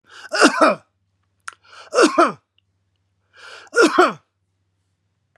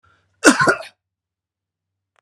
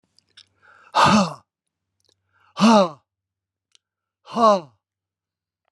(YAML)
three_cough_length: 5.4 s
three_cough_amplitude: 32760
three_cough_signal_mean_std_ratio: 0.35
cough_length: 2.2 s
cough_amplitude: 32768
cough_signal_mean_std_ratio: 0.28
exhalation_length: 5.7 s
exhalation_amplitude: 26509
exhalation_signal_mean_std_ratio: 0.32
survey_phase: beta (2021-08-13 to 2022-03-07)
age: 65+
gender: Male
wearing_mask: 'No'
symptom_none: true
smoker_status: Never smoked
respiratory_condition_asthma: false
respiratory_condition_other: false
recruitment_source: REACT
submission_delay: 1 day
covid_test_result: Negative
covid_test_method: RT-qPCR